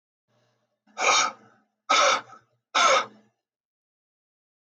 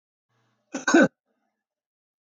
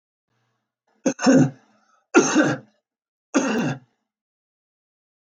{"exhalation_length": "4.6 s", "exhalation_amplitude": 12627, "exhalation_signal_mean_std_ratio": 0.37, "cough_length": "2.4 s", "cough_amplitude": 16966, "cough_signal_mean_std_ratio": 0.24, "three_cough_length": "5.2 s", "three_cough_amplitude": 27711, "three_cough_signal_mean_std_ratio": 0.36, "survey_phase": "beta (2021-08-13 to 2022-03-07)", "age": "65+", "gender": "Male", "wearing_mask": "No", "symptom_cough_any": true, "smoker_status": "Ex-smoker", "respiratory_condition_asthma": false, "respiratory_condition_other": false, "recruitment_source": "REACT", "submission_delay": "2 days", "covid_test_result": "Negative", "covid_test_method": "RT-qPCR", "influenza_a_test_result": "Negative", "influenza_b_test_result": "Negative"}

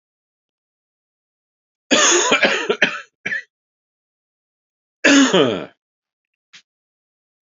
{"cough_length": "7.6 s", "cough_amplitude": 30797, "cough_signal_mean_std_ratio": 0.35, "survey_phase": "alpha (2021-03-01 to 2021-08-12)", "age": "45-64", "gender": "Male", "wearing_mask": "Yes", "symptom_cough_any": true, "symptom_headache": true, "smoker_status": "Never smoked", "respiratory_condition_asthma": false, "respiratory_condition_other": false, "recruitment_source": "Test and Trace", "submission_delay": "2 days", "covid_test_result": "Positive", "covid_test_method": "RT-qPCR", "covid_ct_value": 25.5, "covid_ct_gene": "ORF1ab gene", "covid_ct_mean": 25.8, "covid_viral_load": "3400 copies/ml", "covid_viral_load_category": "Minimal viral load (< 10K copies/ml)"}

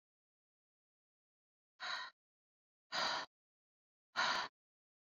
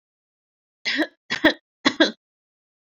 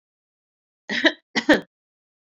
{"exhalation_length": "5.0 s", "exhalation_amplitude": 2538, "exhalation_signal_mean_std_ratio": 0.32, "three_cough_length": "2.8 s", "three_cough_amplitude": 24020, "three_cough_signal_mean_std_ratio": 0.31, "cough_length": "2.4 s", "cough_amplitude": 26307, "cough_signal_mean_std_ratio": 0.27, "survey_phase": "beta (2021-08-13 to 2022-03-07)", "age": "45-64", "gender": "Female", "wearing_mask": "No", "symptom_cough_any": true, "symptom_fever_high_temperature": true, "symptom_onset": "7 days", "smoker_status": "Never smoked", "respiratory_condition_asthma": false, "respiratory_condition_other": false, "recruitment_source": "Test and Trace", "submission_delay": "5 days", "covid_test_result": "Negative", "covid_test_method": "RT-qPCR"}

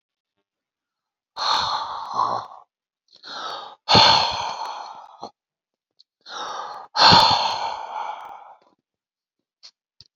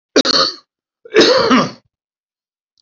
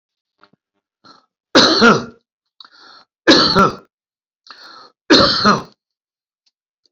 {"exhalation_length": "10.2 s", "exhalation_amplitude": 31041, "exhalation_signal_mean_std_ratio": 0.4, "cough_length": "2.8 s", "cough_amplitude": 31687, "cough_signal_mean_std_ratio": 0.46, "three_cough_length": "6.9 s", "three_cough_amplitude": 31717, "three_cough_signal_mean_std_ratio": 0.37, "survey_phase": "beta (2021-08-13 to 2022-03-07)", "age": "65+", "gender": "Male", "wearing_mask": "No", "symptom_none": true, "smoker_status": "Current smoker (e-cigarettes or vapes only)", "respiratory_condition_asthma": false, "respiratory_condition_other": false, "recruitment_source": "REACT", "submission_delay": "1 day", "covid_test_result": "Negative", "covid_test_method": "RT-qPCR", "influenza_a_test_result": "Unknown/Void", "influenza_b_test_result": "Unknown/Void"}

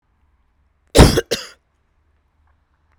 {"cough_length": "3.0 s", "cough_amplitude": 32768, "cough_signal_mean_std_ratio": 0.23, "survey_phase": "beta (2021-08-13 to 2022-03-07)", "age": "65+", "gender": "Female", "wearing_mask": "No", "symptom_cough_any": true, "symptom_runny_or_blocked_nose": true, "symptom_change_to_sense_of_smell_or_taste": true, "symptom_onset": "4 days", "smoker_status": "Never smoked", "respiratory_condition_asthma": false, "respiratory_condition_other": false, "recruitment_source": "Test and Trace", "submission_delay": "2 days", "covid_test_result": "Positive", "covid_test_method": "LAMP"}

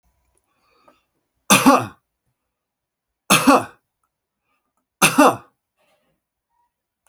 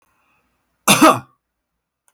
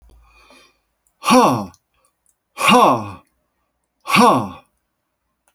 {"three_cough_length": "7.1 s", "three_cough_amplitude": 32768, "three_cough_signal_mean_std_ratio": 0.27, "cough_length": "2.1 s", "cough_amplitude": 32768, "cough_signal_mean_std_ratio": 0.28, "exhalation_length": "5.5 s", "exhalation_amplitude": 29806, "exhalation_signal_mean_std_ratio": 0.38, "survey_phase": "alpha (2021-03-01 to 2021-08-12)", "age": "65+", "gender": "Male", "wearing_mask": "No", "symptom_none": true, "smoker_status": "Never smoked", "respiratory_condition_asthma": false, "respiratory_condition_other": false, "recruitment_source": "REACT", "submission_delay": "1 day", "covid_test_result": "Negative", "covid_test_method": "RT-qPCR"}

